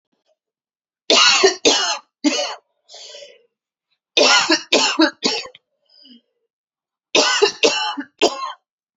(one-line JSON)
{"three_cough_length": "9.0 s", "three_cough_amplitude": 32768, "three_cough_signal_mean_std_ratio": 0.46, "survey_phase": "beta (2021-08-13 to 2022-03-07)", "age": "18-44", "gender": "Female", "wearing_mask": "No", "symptom_fatigue": true, "symptom_onset": "12 days", "smoker_status": "Never smoked", "respiratory_condition_asthma": false, "respiratory_condition_other": false, "recruitment_source": "REACT", "submission_delay": "1 day", "covid_test_result": "Negative", "covid_test_method": "RT-qPCR", "influenza_a_test_result": "Negative", "influenza_b_test_result": "Negative"}